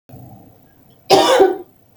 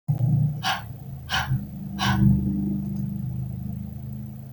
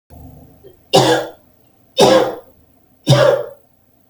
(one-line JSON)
{"cough_length": "2.0 s", "cough_amplitude": 32768, "cough_signal_mean_std_ratio": 0.42, "exhalation_length": "4.5 s", "exhalation_amplitude": 11975, "exhalation_signal_mean_std_ratio": 0.86, "three_cough_length": "4.1 s", "three_cough_amplitude": 32768, "three_cough_signal_mean_std_ratio": 0.43, "survey_phase": "beta (2021-08-13 to 2022-03-07)", "age": "18-44", "gender": "Female", "wearing_mask": "No", "symptom_diarrhoea": true, "symptom_onset": "12 days", "smoker_status": "Ex-smoker", "respiratory_condition_asthma": true, "respiratory_condition_other": false, "recruitment_source": "REACT", "submission_delay": "1 day", "covid_test_result": "Negative", "covid_test_method": "RT-qPCR", "influenza_a_test_result": "Negative", "influenza_b_test_result": "Negative"}